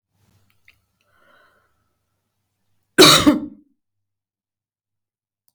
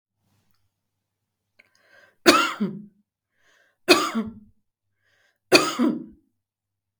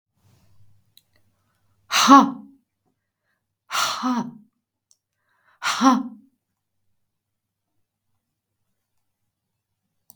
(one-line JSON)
{"cough_length": "5.5 s", "cough_amplitude": 32768, "cough_signal_mean_std_ratio": 0.21, "three_cough_length": "7.0 s", "three_cough_amplitude": 32768, "three_cough_signal_mean_std_ratio": 0.29, "exhalation_length": "10.2 s", "exhalation_amplitude": 32766, "exhalation_signal_mean_std_ratio": 0.24, "survey_phase": "beta (2021-08-13 to 2022-03-07)", "age": "45-64", "gender": "Female", "wearing_mask": "No", "symptom_none": true, "smoker_status": "Never smoked", "respiratory_condition_asthma": false, "respiratory_condition_other": false, "recruitment_source": "REACT", "submission_delay": "1 day", "covid_test_result": "Negative", "covid_test_method": "RT-qPCR", "influenza_a_test_result": "Unknown/Void", "influenza_b_test_result": "Unknown/Void"}